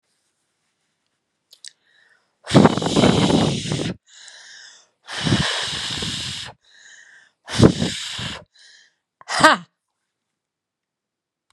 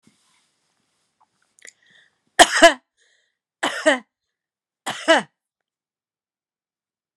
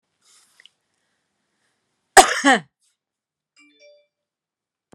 {"exhalation_length": "11.5 s", "exhalation_amplitude": 32768, "exhalation_signal_mean_std_ratio": 0.38, "three_cough_length": "7.2 s", "three_cough_amplitude": 32768, "three_cough_signal_mean_std_ratio": 0.21, "cough_length": "4.9 s", "cough_amplitude": 32768, "cough_signal_mean_std_ratio": 0.18, "survey_phase": "beta (2021-08-13 to 2022-03-07)", "age": "45-64", "gender": "Female", "wearing_mask": "No", "symptom_none": true, "smoker_status": "Current smoker (1 to 10 cigarettes per day)", "respiratory_condition_asthma": false, "respiratory_condition_other": false, "recruitment_source": "REACT", "submission_delay": "1 day", "covid_test_result": "Negative", "covid_test_method": "RT-qPCR"}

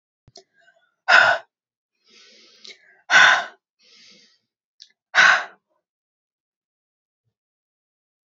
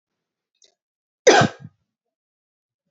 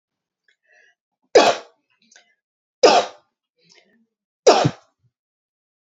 {"exhalation_length": "8.4 s", "exhalation_amplitude": 29361, "exhalation_signal_mean_std_ratio": 0.26, "cough_length": "2.9 s", "cough_amplitude": 27824, "cough_signal_mean_std_ratio": 0.22, "three_cough_length": "5.9 s", "three_cough_amplitude": 28205, "three_cough_signal_mean_std_ratio": 0.26, "survey_phase": "beta (2021-08-13 to 2022-03-07)", "age": "45-64", "gender": "Female", "wearing_mask": "No", "symptom_none": true, "symptom_onset": "6 days", "smoker_status": "Never smoked", "respiratory_condition_asthma": false, "respiratory_condition_other": false, "recruitment_source": "REACT", "submission_delay": "1 day", "covid_test_result": "Negative", "covid_test_method": "RT-qPCR"}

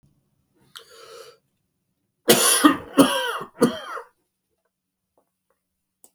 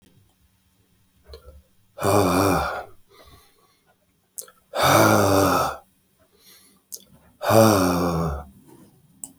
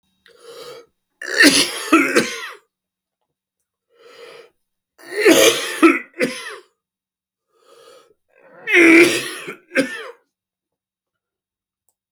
{"cough_length": "6.1 s", "cough_amplitude": 31351, "cough_signal_mean_std_ratio": 0.31, "exhalation_length": "9.4 s", "exhalation_amplitude": 27304, "exhalation_signal_mean_std_ratio": 0.45, "three_cough_length": "12.1 s", "three_cough_amplitude": 32600, "three_cough_signal_mean_std_ratio": 0.36, "survey_phase": "beta (2021-08-13 to 2022-03-07)", "age": "65+", "gender": "Male", "wearing_mask": "No", "symptom_cough_any": true, "symptom_new_continuous_cough": true, "symptom_sore_throat": true, "symptom_abdominal_pain": true, "symptom_fatigue": true, "symptom_headache": true, "symptom_onset": "9 days", "smoker_status": "Ex-smoker", "respiratory_condition_asthma": false, "respiratory_condition_other": false, "recruitment_source": "REACT", "submission_delay": "1 day", "covid_test_result": "Negative", "covid_test_method": "RT-qPCR"}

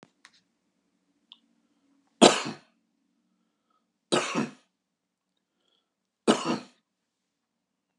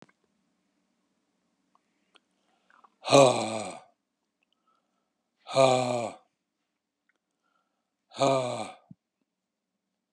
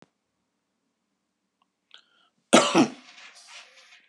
{"three_cough_length": "8.0 s", "three_cough_amplitude": 27643, "three_cough_signal_mean_std_ratio": 0.2, "exhalation_length": "10.1 s", "exhalation_amplitude": 18519, "exhalation_signal_mean_std_ratio": 0.27, "cough_length": "4.1 s", "cough_amplitude": 29677, "cough_signal_mean_std_ratio": 0.23, "survey_phase": "beta (2021-08-13 to 2022-03-07)", "age": "65+", "gender": "Male", "wearing_mask": "No", "symptom_none": true, "smoker_status": "Ex-smoker", "respiratory_condition_asthma": false, "respiratory_condition_other": false, "recruitment_source": "REACT", "submission_delay": "1 day", "covid_test_result": "Negative", "covid_test_method": "RT-qPCR"}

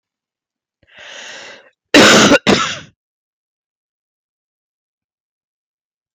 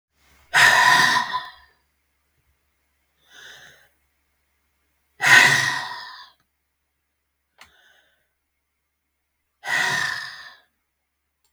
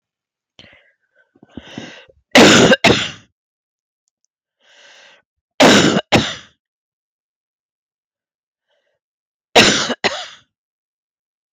{"cough_length": "6.1 s", "cough_amplitude": 32768, "cough_signal_mean_std_ratio": 0.29, "exhalation_length": "11.5 s", "exhalation_amplitude": 32768, "exhalation_signal_mean_std_ratio": 0.32, "three_cough_length": "11.5 s", "three_cough_amplitude": 32768, "three_cough_signal_mean_std_ratio": 0.31, "survey_phase": "beta (2021-08-13 to 2022-03-07)", "age": "45-64", "gender": "Female", "wearing_mask": "No", "symptom_cough_any": true, "symptom_runny_or_blocked_nose": true, "symptom_headache": true, "smoker_status": "Never smoked", "respiratory_condition_asthma": false, "respiratory_condition_other": false, "recruitment_source": "Test and Trace", "submission_delay": "2 days", "covid_test_result": "Positive", "covid_test_method": "RT-qPCR", "covid_ct_value": 18.6, "covid_ct_gene": "N gene"}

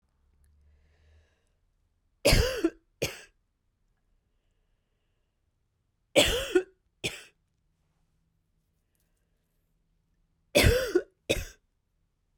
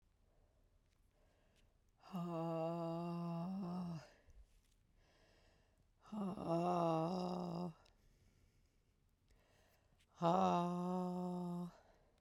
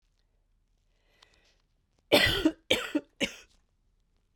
{"three_cough_length": "12.4 s", "three_cough_amplitude": 17331, "three_cough_signal_mean_std_ratio": 0.26, "exhalation_length": "12.2 s", "exhalation_amplitude": 2509, "exhalation_signal_mean_std_ratio": 0.57, "cough_length": "4.4 s", "cough_amplitude": 15366, "cough_signal_mean_std_ratio": 0.3, "survey_phase": "beta (2021-08-13 to 2022-03-07)", "age": "18-44", "gender": "Female", "wearing_mask": "No", "symptom_cough_any": true, "symptom_runny_or_blocked_nose": true, "symptom_sore_throat": true, "symptom_abdominal_pain": true, "symptom_fever_high_temperature": true, "symptom_headache": true, "symptom_loss_of_taste": true, "symptom_other": true, "symptom_onset": "6 days", "smoker_status": "Ex-smoker", "respiratory_condition_asthma": false, "respiratory_condition_other": false, "recruitment_source": "Test and Trace", "submission_delay": "1 day", "covid_test_result": "Positive", "covid_test_method": "RT-qPCR", "covid_ct_value": 18.1, "covid_ct_gene": "ORF1ab gene"}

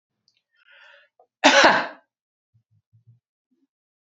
{"cough_length": "4.0 s", "cough_amplitude": 29131, "cough_signal_mean_std_ratio": 0.25, "survey_phase": "beta (2021-08-13 to 2022-03-07)", "age": "65+", "gender": "Female", "wearing_mask": "No", "symptom_none": true, "smoker_status": "Never smoked", "respiratory_condition_asthma": false, "respiratory_condition_other": false, "recruitment_source": "REACT", "submission_delay": "1 day", "covid_test_result": "Negative", "covid_test_method": "RT-qPCR"}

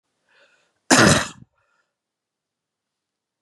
{"cough_length": "3.4 s", "cough_amplitude": 32767, "cough_signal_mean_std_ratio": 0.25, "survey_phase": "beta (2021-08-13 to 2022-03-07)", "age": "45-64", "gender": "Female", "wearing_mask": "No", "symptom_cough_any": true, "symptom_runny_or_blocked_nose": true, "symptom_sore_throat": true, "symptom_abdominal_pain": true, "symptom_fatigue": true, "symptom_headache": true, "smoker_status": "Never smoked", "respiratory_condition_asthma": false, "respiratory_condition_other": false, "recruitment_source": "Test and Trace", "submission_delay": "2 days", "covid_test_result": "Positive", "covid_test_method": "RT-qPCR", "covid_ct_value": 28.6, "covid_ct_gene": "ORF1ab gene"}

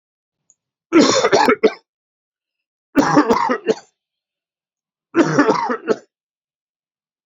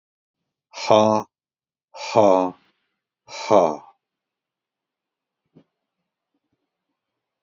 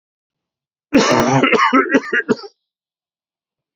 {"three_cough_length": "7.3 s", "three_cough_amplitude": 29940, "three_cough_signal_mean_std_ratio": 0.41, "exhalation_length": "7.4 s", "exhalation_amplitude": 30617, "exhalation_signal_mean_std_ratio": 0.27, "cough_length": "3.8 s", "cough_amplitude": 29312, "cough_signal_mean_std_ratio": 0.48, "survey_phase": "beta (2021-08-13 to 2022-03-07)", "age": "45-64", "gender": "Male", "wearing_mask": "No", "symptom_headache": true, "smoker_status": "Ex-smoker", "respiratory_condition_asthma": false, "respiratory_condition_other": false, "recruitment_source": "REACT", "submission_delay": "7 days", "covid_test_result": "Negative", "covid_test_method": "RT-qPCR", "influenza_a_test_result": "Negative", "influenza_b_test_result": "Negative"}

